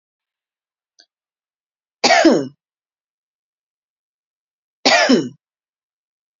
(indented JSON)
{
  "cough_length": "6.4 s",
  "cough_amplitude": 30161,
  "cough_signal_mean_std_ratio": 0.28,
  "survey_phase": "beta (2021-08-13 to 2022-03-07)",
  "age": "45-64",
  "gender": "Female",
  "wearing_mask": "No",
  "symptom_none": true,
  "smoker_status": "Ex-smoker",
  "respiratory_condition_asthma": false,
  "respiratory_condition_other": false,
  "recruitment_source": "REACT",
  "submission_delay": "3 days",
  "covid_test_result": "Negative",
  "covid_test_method": "RT-qPCR",
  "influenza_a_test_result": "Negative",
  "influenza_b_test_result": "Negative"
}